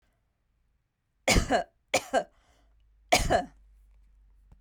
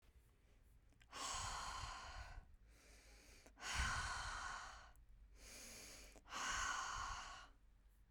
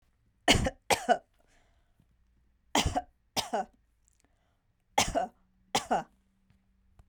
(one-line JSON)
{"three_cough_length": "4.6 s", "three_cough_amplitude": 14118, "three_cough_signal_mean_std_ratio": 0.33, "exhalation_length": "8.1 s", "exhalation_amplitude": 1066, "exhalation_signal_mean_std_ratio": 0.69, "cough_length": "7.1 s", "cough_amplitude": 12642, "cough_signal_mean_std_ratio": 0.32, "survey_phase": "beta (2021-08-13 to 2022-03-07)", "age": "45-64", "gender": "Female", "wearing_mask": "No", "symptom_none": true, "smoker_status": "Never smoked", "respiratory_condition_asthma": false, "respiratory_condition_other": false, "recruitment_source": "REACT", "submission_delay": "1 day", "covid_test_result": "Negative", "covid_test_method": "RT-qPCR"}